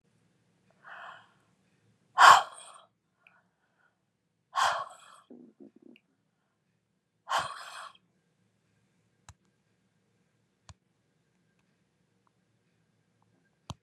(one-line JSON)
{"exhalation_length": "13.8 s", "exhalation_amplitude": 24641, "exhalation_signal_mean_std_ratio": 0.16, "survey_phase": "beta (2021-08-13 to 2022-03-07)", "age": "65+", "gender": "Female", "wearing_mask": "No", "symptom_none": true, "smoker_status": "Never smoked", "respiratory_condition_asthma": false, "respiratory_condition_other": false, "recruitment_source": "REACT", "submission_delay": "1 day", "covid_test_result": "Negative", "covid_test_method": "RT-qPCR", "influenza_a_test_result": "Unknown/Void", "influenza_b_test_result": "Unknown/Void"}